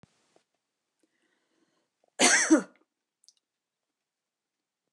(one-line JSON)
{"cough_length": "4.9 s", "cough_amplitude": 13565, "cough_signal_mean_std_ratio": 0.22, "survey_phase": "beta (2021-08-13 to 2022-03-07)", "age": "65+", "gender": "Female", "wearing_mask": "No", "symptom_runny_or_blocked_nose": true, "symptom_abdominal_pain": true, "symptom_onset": "12 days", "smoker_status": "Never smoked", "respiratory_condition_asthma": false, "respiratory_condition_other": false, "recruitment_source": "REACT", "submission_delay": "1 day", "covid_test_result": "Negative", "covid_test_method": "RT-qPCR", "influenza_a_test_result": "Negative", "influenza_b_test_result": "Negative"}